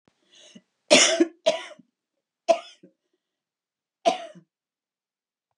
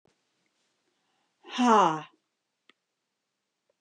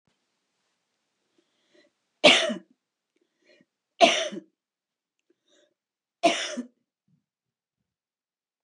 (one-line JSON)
{"cough_length": "5.6 s", "cough_amplitude": 28221, "cough_signal_mean_std_ratio": 0.26, "exhalation_length": "3.8 s", "exhalation_amplitude": 13325, "exhalation_signal_mean_std_ratio": 0.26, "three_cough_length": "8.6 s", "three_cough_amplitude": 26984, "three_cough_signal_mean_std_ratio": 0.22, "survey_phase": "beta (2021-08-13 to 2022-03-07)", "age": "65+", "gender": "Female", "wearing_mask": "No", "symptom_none": true, "smoker_status": "Never smoked", "respiratory_condition_asthma": false, "respiratory_condition_other": false, "recruitment_source": "REACT", "submission_delay": "1 day", "covid_test_result": "Negative", "covid_test_method": "RT-qPCR", "influenza_a_test_result": "Negative", "influenza_b_test_result": "Negative"}